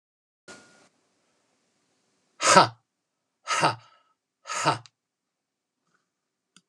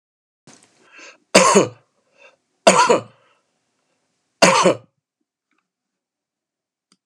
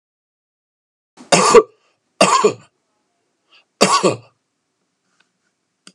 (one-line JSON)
{"exhalation_length": "6.7 s", "exhalation_amplitude": 32269, "exhalation_signal_mean_std_ratio": 0.23, "three_cough_length": "7.1 s", "three_cough_amplitude": 32768, "three_cough_signal_mean_std_ratio": 0.29, "cough_length": "5.9 s", "cough_amplitude": 32768, "cough_signal_mean_std_ratio": 0.3, "survey_phase": "alpha (2021-03-01 to 2021-08-12)", "age": "45-64", "gender": "Male", "wearing_mask": "No", "symptom_none": true, "smoker_status": "Never smoked", "respiratory_condition_asthma": false, "respiratory_condition_other": false, "recruitment_source": "REACT", "submission_delay": "1 day", "covid_test_result": "Negative", "covid_test_method": "RT-qPCR"}